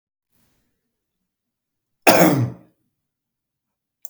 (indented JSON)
{
  "cough_length": "4.1 s",
  "cough_amplitude": 32768,
  "cough_signal_mean_std_ratio": 0.25,
  "survey_phase": "beta (2021-08-13 to 2022-03-07)",
  "age": "45-64",
  "gender": "Male",
  "wearing_mask": "No",
  "symptom_none": true,
  "smoker_status": "Never smoked",
  "respiratory_condition_asthma": false,
  "respiratory_condition_other": false,
  "recruitment_source": "REACT",
  "submission_delay": "10 days",
  "covid_test_result": "Negative",
  "covid_test_method": "RT-qPCR",
  "influenza_a_test_result": "Negative",
  "influenza_b_test_result": "Negative"
}